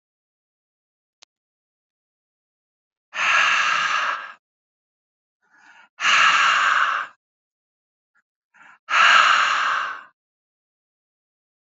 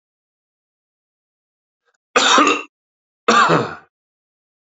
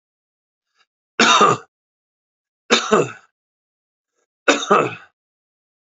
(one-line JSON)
{"exhalation_length": "11.7 s", "exhalation_amplitude": 28335, "exhalation_signal_mean_std_ratio": 0.42, "cough_length": "4.8 s", "cough_amplitude": 32768, "cough_signal_mean_std_ratio": 0.34, "three_cough_length": "6.0 s", "three_cough_amplitude": 32767, "three_cough_signal_mean_std_ratio": 0.32, "survey_phase": "alpha (2021-03-01 to 2021-08-12)", "age": "45-64", "gender": "Male", "wearing_mask": "No", "symptom_change_to_sense_of_smell_or_taste": true, "symptom_loss_of_taste": true, "symptom_onset": "2 days", "smoker_status": "Never smoked", "respiratory_condition_asthma": false, "respiratory_condition_other": false, "recruitment_source": "Test and Trace", "submission_delay": "1 day", "covid_test_result": "Positive", "covid_test_method": "RT-qPCR", "covid_ct_value": 28.8, "covid_ct_gene": "ORF1ab gene", "covid_ct_mean": 30.3, "covid_viral_load": "110 copies/ml", "covid_viral_load_category": "Minimal viral load (< 10K copies/ml)"}